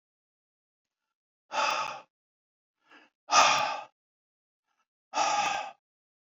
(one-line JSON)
{"exhalation_length": "6.3 s", "exhalation_amplitude": 14205, "exhalation_signal_mean_std_ratio": 0.36, "survey_phase": "beta (2021-08-13 to 2022-03-07)", "age": "65+", "gender": "Male", "wearing_mask": "No", "symptom_none": true, "smoker_status": "Ex-smoker", "respiratory_condition_asthma": false, "respiratory_condition_other": false, "recruitment_source": "REACT", "submission_delay": "2 days", "covid_test_result": "Negative", "covid_test_method": "RT-qPCR"}